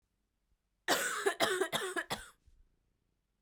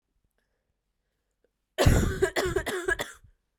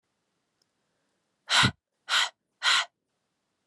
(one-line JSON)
{"cough_length": "3.4 s", "cough_amplitude": 6360, "cough_signal_mean_std_ratio": 0.45, "three_cough_length": "3.6 s", "three_cough_amplitude": 13901, "three_cough_signal_mean_std_ratio": 0.41, "exhalation_length": "3.7 s", "exhalation_amplitude": 14262, "exhalation_signal_mean_std_ratio": 0.32, "survey_phase": "beta (2021-08-13 to 2022-03-07)", "age": "18-44", "gender": "Female", "wearing_mask": "No", "symptom_cough_any": true, "symptom_runny_or_blocked_nose": true, "symptom_shortness_of_breath": true, "symptom_sore_throat": true, "symptom_fever_high_temperature": true, "symptom_headache": true, "symptom_other": true, "symptom_onset": "4 days", "smoker_status": "Never smoked", "respiratory_condition_asthma": false, "respiratory_condition_other": false, "recruitment_source": "Test and Trace", "submission_delay": "1 day", "covid_test_result": "Positive", "covid_test_method": "RT-qPCR"}